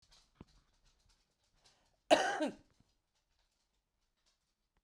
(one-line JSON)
{"cough_length": "4.8 s", "cough_amplitude": 8676, "cough_signal_mean_std_ratio": 0.2, "survey_phase": "beta (2021-08-13 to 2022-03-07)", "age": "45-64", "gender": "Female", "wearing_mask": "No", "symptom_none": true, "smoker_status": "Current smoker (11 or more cigarettes per day)", "respiratory_condition_asthma": false, "respiratory_condition_other": false, "recruitment_source": "REACT", "submission_delay": "1 day", "covid_test_result": "Negative", "covid_test_method": "RT-qPCR", "influenza_a_test_result": "Negative", "influenza_b_test_result": "Negative"}